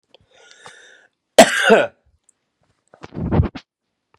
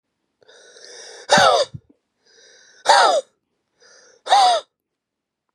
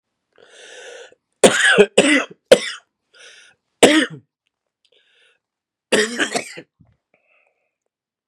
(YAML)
cough_length: 4.2 s
cough_amplitude: 32768
cough_signal_mean_std_ratio: 0.29
exhalation_length: 5.5 s
exhalation_amplitude: 30307
exhalation_signal_mean_std_ratio: 0.37
three_cough_length: 8.3 s
three_cough_amplitude: 32768
three_cough_signal_mean_std_ratio: 0.31
survey_phase: beta (2021-08-13 to 2022-03-07)
age: 18-44
gender: Male
wearing_mask: 'No'
symptom_cough_any: true
symptom_runny_or_blocked_nose: true
symptom_shortness_of_breath: true
symptom_fatigue: true
symptom_fever_high_temperature: true
symptom_headache: true
symptom_onset: 7 days
smoker_status: Never smoked
respiratory_condition_asthma: false
respiratory_condition_other: false
recruitment_source: Test and Trace
submission_delay: 5 days
covid_test_result: Positive
covid_test_method: RT-qPCR
covid_ct_value: 22.0
covid_ct_gene: ORF1ab gene